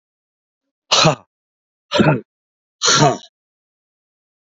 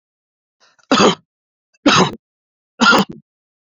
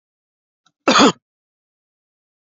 {"exhalation_length": "4.5 s", "exhalation_amplitude": 31997, "exhalation_signal_mean_std_ratio": 0.34, "three_cough_length": "3.8 s", "three_cough_amplitude": 29970, "three_cough_signal_mean_std_ratio": 0.36, "cough_length": "2.6 s", "cough_amplitude": 29534, "cough_signal_mean_std_ratio": 0.25, "survey_phase": "beta (2021-08-13 to 2022-03-07)", "age": "45-64", "gender": "Male", "wearing_mask": "No", "symptom_none": true, "smoker_status": "Ex-smoker", "respiratory_condition_asthma": false, "respiratory_condition_other": false, "recruitment_source": "REACT", "submission_delay": "3 days", "covid_test_result": "Negative", "covid_test_method": "RT-qPCR", "influenza_a_test_result": "Negative", "influenza_b_test_result": "Negative"}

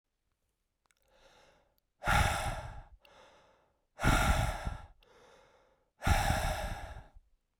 {"exhalation_length": "7.6 s", "exhalation_amplitude": 6800, "exhalation_signal_mean_std_ratio": 0.43, "survey_phase": "beta (2021-08-13 to 2022-03-07)", "age": "18-44", "gender": "Male", "wearing_mask": "No", "symptom_cough_any": true, "symptom_new_continuous_cough": true, "symptom_runny_or_blocked_nose": true, "symptom_fatigue": true, "symptom_headache": true, "symptom_change_to_sense_of_smell_or_taste": true, "symptom_loss_of_taste": true, "symptom_onset": "4 days", "smoker_status": "Never smoked", "respiratory_condition_asthma": false, "respiratory_condition_other": false, "recruitment_source": "Test and Trace", "submission_delay": "1 day", "covid_test_result": "Positive", "covid_test_method": "RT-qPCR", "covid_ct_value": 16.7, "covid_ct_gene": "ORF1ab gene", "covid_ct_mean": 17.4, "covid_viral_load": "2000000 copies/ml", "covid_viral_load_category": "High viral load (>1M copies/ml)"}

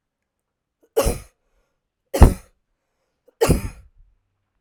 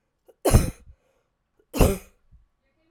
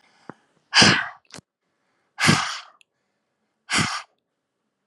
{"three_cough_length": "4.6 s", "three_cough_amplitude": 32768, "three_cough_signal_mean_std_ratio": 0.23, "cough_length": "2.9 s", "cough_amplitude": 24065, "cough_signal_mean_std_ratio": 0.29, "exhalation_length": "4.9 s", "exhalation_amplitude": 29890, "exhalation_signal_mean_std_ratio": 0.32, "survey_phase": "alpha (2021-03-01 to 2021-08-12)", "age": "45-64", "gender": "Female", "wearing_mask": "No", "symptom_none": true, "smoker_status": "Never smoked", "respiratory_condition_asthma": true, "respiratory_condition_other": false, "recruitment_source": "REACT", "submission_delay": "2 days", "covid_test_result": "Negative", "covid_test_method": "RT-qPCR"}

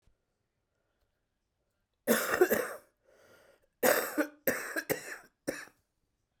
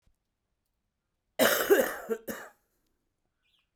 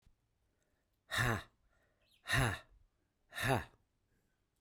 {"three_cough_length": "6.4 s", "three_cough_amplitude": 9583, "three_cough_signal_mean_std_ratio": 0.36, "cough_length": "3.8 s", "cough_amplitude": 10987, "cough_signal_mean_std_ratio": 0.32, "exhalation_length": "4.6 s", "exhalation_amplitude": 3339, "exhalation_signal_mean_std_ratio": 0.35, "survey_phase": "beta (2021-08-13 to 2022-03-07)", "age": "18-44", "gender": "Male", "wearing_mask": "No", "symptom_cough_any": true, "symptom_new_continuous_cough": true, "symptom_runny_or_blocked_nose": true, "symptom_shortness_of_breath": true, "symptom_sore_throat": true, "symptom_diarrhoea": true, "symptom_fatigue": true, "symptom_fever_high_temperature": true, "symptom_headache": true, "symptom_other": true, "symptom_onset": "2 days", "smoker_status": "Never smoked", "respiratory_condition_asthma": false, "respiratory_condition_other": false, "recruitment_source": "Test and Trace", "submission_delay": "2 days", "covid_test_result": "Positive", "covid_test_method": "RT-qPCR", "covid_ct_value": 12.0, "covid_ct_gene": "S gene", "covid_ct_mean": 12.4, "covid_viral_load": "87000000 copies/ml", "covid_viral_load_category": "High viral load (>1M copies/ml)"}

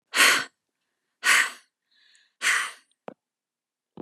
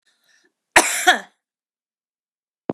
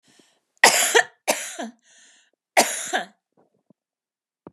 {"exhalation_length": "4.0 s", "exhalation_amplitude": 20104, "exhalation_signal_mean_std_ratio": 0.35, "cough_length": "2.7 s", "cough_amplitude": 32768, "cough_signal_mean_std_ratio": 0.25, "three_cough_length": "4.5 s", "three_cough_amplitude": 32767, "three_cough_signal_mean_std_ratio": 0.32, "survey_phase": "beta (2021-08-13 to 2022-03-07)", "age": "45-64", "gender": "Female", "wearing_mask": "No", "symptom_none": true, "smoker_status": "Ex-smoker", "respiratory_condition_asthma": false, "respiratory_condition_other": false, "recruitment_source": "REACT", "submission_delay": "0 days", "covid_test_result": "Negative", "covid_test_method": "RT-qPCR", "influenza_a_test_result": "Negative", "influenza_b_test_result": "Negative"}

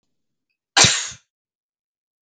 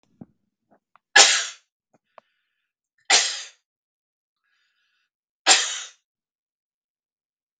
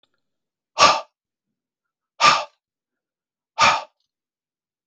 {"cough_length": "2.2 s", "cough_amplitude": 32768, "cough_signal_mean_std_ratio": 0.26, "three_cough_length": "7.6 s", "three_cough_amplitude": 32768, "three_cough_signal_mean_std_ratio": 0.23, "exhalation_length": "4.9 s", "exhalation_amplitude": 32487, "exhalation_signal_mean_std_ratio": 0.27, "survey_phase": "beta (2021-08-13 to 2022-03-07)", "age": "45-64", "gender": "Male", "wearing_mask": "No", "symptom_none": true, "smoker_status": "Never smoked", "respiratory_condition_asthma": false, "respiratory_condition_other": false, "recruitment_source": "REACT", "submission_delay": "3 days", "covid_test_result": "Negative", "covid_test_method": "RT-qPCR", "influenza_a_test_result": "Negative", "influenza_b_test_result": "Negative"}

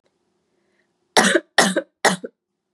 {"three_cough_length": "2.7 s", "three_cough_amplitude": 32768, "three_cough_signal_mean_std_ratio": 0.34, "survey_phase": "beta (2021-08-13 to 2022-03-07)", "age": "18-44", "gender": "Female", "wearing_mask": "No", "symptom_cough_any": true, "symptom_onset": "4 days", "smoker_status": "Never smoked", "respiratory_condition_asthma": false, "respiratory_condition_other": false, "recruitment_source": "REACT", "submission_delay": "1 day", "covid_test_result": "Negative", "covid_test_method": "RT-qPCR", "influenza_a_test_result": "Negative", "influenza_b_test_result": "Negative"}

